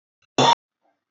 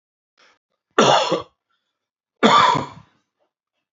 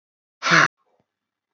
{"cough_length": "1.1 s", "cough_amplitude": 19187, "cough_signal_mean_std_ratio": 0.31, "three_cough_length": "3.9 s", "three_cough_amplitude": 27087, "three_cough_signal_mean_std_ratio": 0.36, "exhalation_length": "1.5 s", "exhalation_amplitude": 26108, "exhalation_signal_mean_std_ratio": 0.3, "survey_phase": "alpha (2021-03-01 to 2021-08-12)", "age": "45-64", "gender": "Male", "wearing_mask": "No", "symptom_none": true, "smoker_status": "Never smoked", "respiratory_condition_asthma": false, "respiratory_condition_other": false, "recruitment_source": "REACT", "submission_delay": "1 day", "covid_test_result": "Negative", "covid_test_method": "RT-qPCR"}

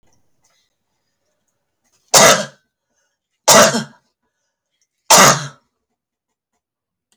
{"three_cough_length": "7.2 s", "three_cough_amplitude": 32768, "three_cough_signal_mean_std_ratio": 0.29, "survey_phase": "alpha (2021-03-01 to 2021-08-12)", "age": "65+", "gender": "Female", "wearing_mask": "No", "symptom_none": true, "smoker_status": "Ex-smoker", "respiratory_condition_asthma": false, "respiratory_condition_other": false, "recruitment_source": "REACT", "submission_delay": "2 days", "covid_test_result": "Negative", "covid_test_method": "RT-qPCR"}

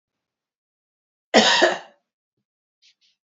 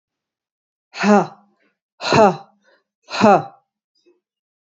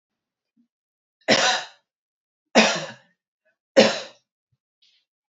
{"cough_length": "3.3 s", "cough_amplitude": 27555, "cough_signal_mean_std_ratio": 0.27, "exhalation_length": "4.7 s", "exhalation_amplitude": 28447, "exhalation_signal_mean_std_ratio": 0.32, "three_cough_length": "5.3 s", "three_cough_amplitude": 28990, "three_cough_signal_mean_std_ratio": 0.29, "survey_phase": "alpha (2021-03-01 to 2021-08-12)", "age": "45-64", "gender": "Female", "wearing_mask": "No", "symptom_none": true, "smoker_status": "Never smoked", "respiratory_condition_asthma": false, "respiratory_condition_other": false, "recruitment_source": "REACT", "submission_delay": "3 days", "covid_test_result": "Negative", "covid_test_method": "RT-qPCR"}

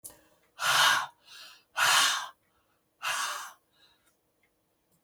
{"exhalation_length": "5.0 s", "exhalation_amplitude": 8917, "exhalation_signal_mean_std_ratio": 0.41, "survey_phase": "beta (2021-08-13 to 2022-03-07)", "age": "65+", "gender": "Female", "wearing_mask": "No", "symptom_none": true, "smoker_status": "Ex-smoker", "respiratory_condition_asthma": false, "respiratory_condition_other": false, "recruitment_source": "REACT", "submission_delay": "2 days", "covid_test_result": "Negative", "covid_test_method": "RT-qPCR", "influenza_a_test_result": "Negative", "influenza_b_test_result": "Negative"}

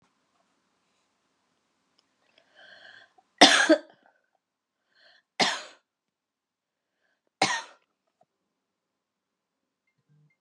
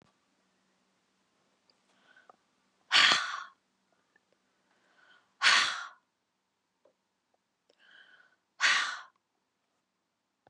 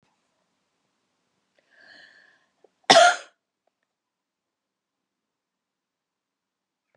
{"three_cough_length": "10.4 s", "three_cough_amplitude": 30123, "three_cough_signal_mean_std_ratio": 0.18, "exhalation_length": "10.5 s", "exhalation_amplitude": 13463, "exhalation_signal_mean_std_ratio": 0.25, "cough_length": "7.0 s", "cough_amplitude": 32562, "cough_signal_mean_std_ratio": 0.15, "survey_phase": "beta (2021-08-13 to 2022-03-07)", "age": "45-64", "gender": "Female", "wearing_mask": "No", "symptom_cough_any": true, "symptom_new_continuous_cough": true, "symptom_runny_or_blocked_nose": true, "symptom_shortness_of_breath": true, "symptom_sore_throat": true, "symptom_headache": true, "symptom_onset": "2 days", "smoker_status": "Never smoked", "respiratory_condition_asthma": true, "respiratory_condition_other": false, "recruitment_source": "Test and Trace", "submission_delay": "1 day", "covid_test_result": "Positive", "covid_test_method": "RT-qPCR", "covid_ct_value": 24.4, "covid_ct_gene": "ORF1ab gene"}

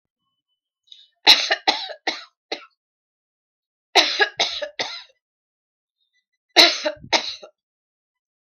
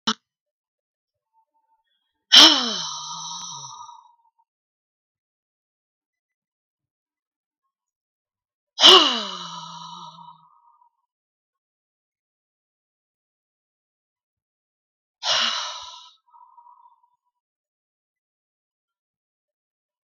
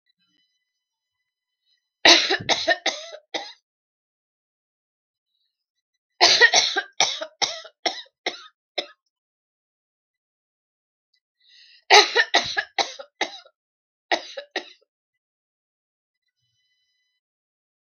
{"cough_length": "8.5 s", "cough_amplitude": 32768, "cough_signal_mean_std_ratio": 0.29, "exhalation_length": "20.1 s", "exhalation_amplitude": 32768, "exhalation_signal_mean_std_ratio": 0.2, "three_cough_length": "17.8 s", "three_cough_amplitude": 32768, "three_cough_signal_mean_std_ratio": 0.26, "survey_phase": "beta (2021-08-13 to 2022-03-07)", "age": "65+", "gender": "Female", "wearing_mask": "No", "symptom_none": true, "smoker_status": "Never smoked", "respiratory_condition_asthma": false, "respiratory_condition_other": false, "recruitment_source": "REACT", "submission_delay": "6 days", "covid_test_result": "Negative", "covid_test_method": "RT-qPCR", "influenza_a_test_result": "Unknown/Void", "influenza_b_test_result": "Unknown/Void"}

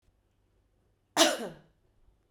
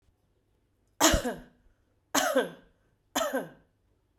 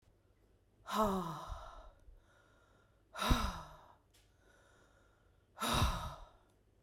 {"cough_length": "2.3 s", "cough_amplitude": 14548, "cough_signal_mean_std_ratio": 0.25, "three_cough_length": "4.2 s", "three_cough_amplitude": 14659, "three_cough_signal_mean_std_ratio": 0.37, "exhalation_length": "6.8 s", "exhalation_amplitude": 4782, "exhalation_signal_mean_std_ratio": 0.4, "survey_phase": "beta (2021-08-13 to 2022-03-07)", "age": "45-64", "gender": "Female", "wearing_mask": "No", "symptom_fatigue": true, "symptom_headache": true, "smoker_status": "Ex-smoker", "respiratory_condition_asthma": false, "respiratory_condition_other": false, "recruitment_source": "Test and Trace", "submission_delay": "1 day", "covid_test_result": "Positive", "covid_test_method": "RT-qPCR", "covid_ct_value": 32.5, "covid_ct_gene": "N gene"}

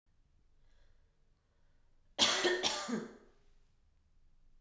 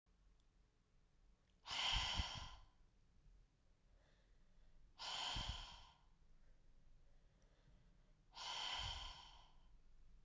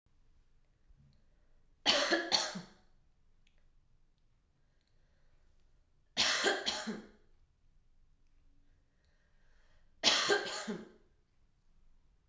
{"cough_length": "4.6 s", "cough_amplitude": 5852, "cough_signal_mean_std_ratio": 0.36, "exhalation_length": "10.2 s", "exhalation_amplitude": 1146, "exhalation_signal_mean_std_ratio": 0.48, "three_cough_length": "12.3 s", "three_cough_amplitude": 8313, "three_cough_signal_mean_std_ratio": 0.34, "survey_phase": "beta (2021-08-13 to 2022-03-07)", "age": "18-44", "gender": "Female", "wearing_mask": "No", "symptom_none": true, "smoker_status": "Ex-smoker", "respiratory_condition_asthma": false, "respiratory_condition_other": false, "recruitment_source": "REACT", "submission_delay": "1 day", "covid_test_result": "Negative", "covid_test_method": "RT-qPCR"}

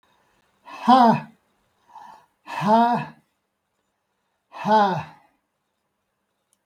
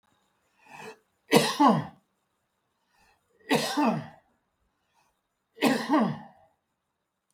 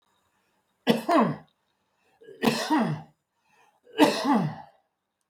{"exhalation_length": "6.7 s", "exhalation_amplitude": 25957, "exhalation_signal_mean_std_ratio": 0.35, "cough_length": "7.3 s", "cough_amplitude": 18240, "cough_signal_mean_std_ratio": 0.35, "three_cough_length": "5.3 s", "three_cough_amplitude": 17723, "three_cough_signal_mean_std_ratio": 0.42, "survey_phase": "beta (2021-08-13 to 2022-03-07)", "age": "65+", "gender": "Male", "wearing_mask": "No", "symptom_none": true, "smoker_status": "Never smoked", "respiratory_condition_asthma": false, "respiratory_condition_other": false, "recruitment_source": "REACT", "submission_delay": "1 day", "covid_test_result": "Negative", "covid_test_method": "RT-qPCR", "covid_ct_value": 39.0, "covid_ct_gene": "N gene", "influenza_a_test_result": "Negative", "influenza_b_test_result": "Negative"}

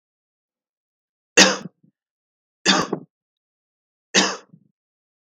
{"three_cough_length": "5.2 s", "three_cough_amplitude": 32768, "three_cough_signal_mean_std_ratio": 0.25, "survey_phase": "beta (2021-08-13 to 2022-03-07)", "age": "18-44", "gender": "Male", "wearing_mask": "No", "symptom_cough_any": true, "symptom_runny_or_blocked_nose": true, "symptom_sore_throat": true, "symptom_fatigue": true, "symptom_onset": "5 days", "smoker_status": "Never smoked", "respiratory_condition_asthma": false, "respiratory_condition_other": false, "recruitment_source": "Test and Trace", "submission_delay": "2 days", "covid_test_result": "Positive", "covid_test_method": "RT-qPCR", "covid_ct_value": 19.2, "covid_ct_gene": "N gene", "covid_ct_mean": 19.4, "covid_viral_load": "440000 copies/ml", "covid_viral_load_category": "Low viral load (10K-1M copies/ml)"}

